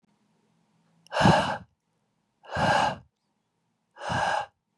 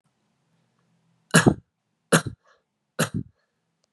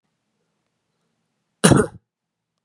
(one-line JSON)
{"exhalation_length": "4.8 s", "exhalation_amplitude": 14564, "exhalation_signal_mean_std_ratio": 0.4, "three_cough_length": "3.9 s", "three_cough_amplitude": 28434, "three_cough_signal_mean_std_ratio": 0.23, "cough_length": "2.6 s", "cough_amplitude": 32768, "cough_signal_mean_std_ratio": 0.21, "survey_phase": "beta (2021-08-13 to 2022-03-07)", "age": "18-44", "gender": "Male", "wearing_mask": "No", "symptom_none": true, "smoker_status": "Never smoked", "respiratory_condition_asthma": false, "respiratory_condition_other": false, "recruitment_source": "REACT", "submission_delay": "0 days", "covid_test_result": "Negative", "covid_test_method": "RT-qPCR"}